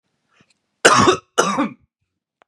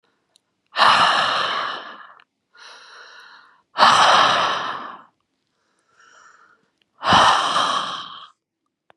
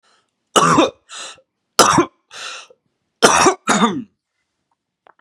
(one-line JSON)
{"cough_length": "2.5 s", "cough_amplitude": 32768, "cough_signal_mean_std_ratio": 0.38, "exhalation_length": "9.0 s", "exhalation_amplitude": 30896, "exhalation_signal_mean_std_ratio": 0.47, "three_cough_length": "5.2 s", "three_cough_amplitude": 32768, "three_cough_signal_mean_std_ratio": 0.41, "survey_phase": "beta (2021-08-13 to 2022-03-07)", "age": "18-44", "gender": "Male", "wearing_mask": "No", "symptom_none": true, "smoker_status": "Ex-smoker", "respiratory_condition_asthma": true, "respiratory_condition_other": false, "recruitment_source": "REACT", "submission_delay": "1 day", "covid_test_result": "Negative", "covid_test_method": "RT-qPCR"}